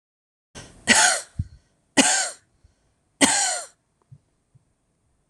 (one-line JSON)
{"three_cough_length": "5.3 s", "three_cough_amplitude": 26027, "three_cough_signal_mean_std_ratio": 0.35, "survey_phase": "alpha (2021-03-01 to 2021-08-12)", "age": "45-64", "gender": "Female", "wearing_mask": "No", "symptom_none": true, "smoker_status": "Ex-smoker", "respiratory_condition_asthma": false, "respiratory_condition_other": false, "recruitment_source": "REACT", "submission_delay": "1 day", "covid_test_result": "Negative", "covid_test_method": "RT-qPCR"}